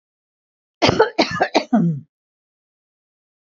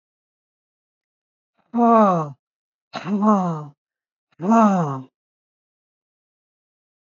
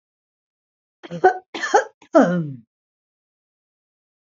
{"cough_length": "3.4 s", "cough_amplitude": 29873, "cough_signal_mean_std_ratio": 0.38, "exhalation_length": "7.1 s", "exhalation_amplitude": 22252, "exhalation_signal_mean_std_ratio": 0.39, "three_cough_length": "4.3 s", "three_cough_amplitude": 26713, "three_cough_signal_mean_std_ratio": 0.3, "survey_phase": "beta (2021-08-13 to 2022-03-07)", "age": "65+", "gender": "Female", "wearing_mask": "No", "symptom_cough_any": true, "symptom_onset": "12 days", "smoker_status": "Ex-smoker", "respiratory_condition_asthma": false, "respiratory_condition_other": false, "recruitment_source": "REACT", "submission_delay": "2 days", "covid_test_result": "Negative", "covid_test_method": "RT-qPCR", "influenza_a_test_result": "Unknown/Void", "influenza_b_test_result": "Unknown/Void"}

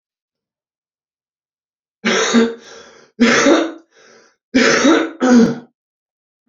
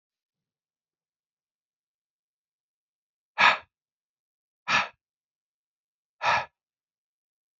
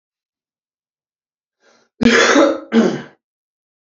{"three_cough_length": "6.5 s", "three_cough_amplitude": 30807, "three_cough_signal_mean_std_ratio": 0.46, "exhalation_length": "7.6 s", "exhalation_amplitude": 17298, "exhalation_signal_mean_std_ratio": 0.2, "cough_length": "3.8 s", "cough_amplitude": 29966, "cough_signal_mean_std_ratio": 0.37, "survey_phase": "beta (2021-08-13 to 2022-03-07)", "age": "45-64", "gender": "Male", "wearing_mask": "Yes", "symptom_cough_any": true, "symptom_diarrhoea": true, "symptom_fatigue": true, "symptom_fever_high_temperature": true, "symptom_headache": true, "symptom_onset": "3 days", "smoker_status": "Ex-smoker", "respiratory_condition_asthma": false, "respiratory_condition_other": false, "recruitment_source": "Test and Trace", "submission_delay": "2 days", "covid_test_result": "Positive", "covid_test_method": "RT-qPCR", "covid_ct_value": 23.4, "covid_ct_gene": "ORF1ab gene", "covid_ct_mean": 23.7, "covid_viral_load": "17000 copies/ml", "covid_viral_load_category": "Low viral load (10K-1M copies/ml)"}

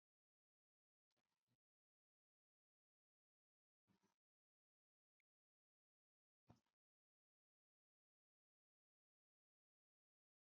{"exhalation_length": "10.4 s", "exhalation_amplitude": 62, "exhalation_signal_mean_std_ratio": 0.1, "survey_phase": "beta (2021-08-13 to 2022-03-07)", "age": "65+", "gender": "Male", "wearing_mask": "No", "symptom_none": true, "smoker_status": "Never smoked", "respiratory_condition_asthma": false, "respiratory_condition_other": false, "recruitment_source": "REACT", "submission_delay": "1 day", "covid_test_result": "Negative", "covid_test_method": "RT-qPCR", "influenza_a_test_result": "Negative", "influenza_b_test_result": "Negative"}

